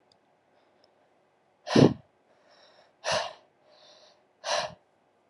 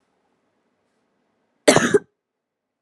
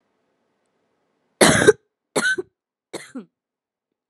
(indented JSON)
{
  "exhalation_length": "5.3 s",
  "exhalation_amplitude": 21696,
  "exhalation_signal_mean_std_ratio": 0.24,
  "cough_length": "2.8 s",
  "cough_amplitude": 32767,
  "cough_signal_mean_std_ratio": 0.23,
  "three_cough_length": "4.1 s",
  "three_cough_amplitude": 32767,
  "three_cough_signal_mean_std_ratio": 0.27,
  "survey_phase": "alpha (2021-03-01 to 2021-08-12)",
  "age": "18-44",
  "gender": "Female",
  "wearing_mask": "No",
  "symptom_cough_any": true,
  "symptom_new_continuous_cough": true,
  "symptom_shortness_of_breath": true,
  "symptom_diarrhoea": true,
  "symptom_headache": true,
  "smoker_status": "Never smoked",
  "respiratory_condition_asthma": false,
  "respiratory_condition_other": false,
  "recruitment_source": "Test and Trace",
  "submission_delay": "2 days",
  "covid_test_result": "Positive",
  "covid_test_method": "RT-qPCR",
  "covid_ct_value": 17.7,
  "covid_ct_gene": "N gene",
  "covid_ct_mean": 18.4,
  "covid_viral_load": "930000 copies/ml",
  "covid_viral_load_category": "Low viral load (10K-1M copies/ml)"
}